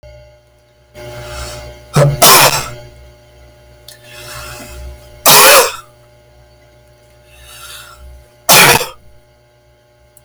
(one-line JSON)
{"three_cough_length": "10.2 s", "three_cough_amplitude": 32768, "three_cough_signal_mean_std_ratio": 0.39, "survey_phase": "beta (2021-08-13 to 2022-03-07)", "age": "45-64", "gender": "Male", "wearing_mask": "No", "symptom_none": true, "smoker_status": "Never smoked", "respiratory_condition_asthma": false, "respiratory_condition_other": false, "recruitment_source": "REACT", "submission_delay": "1 day", "covid_test_result": "Negative", "covid_test_method": "RT-qPCR"}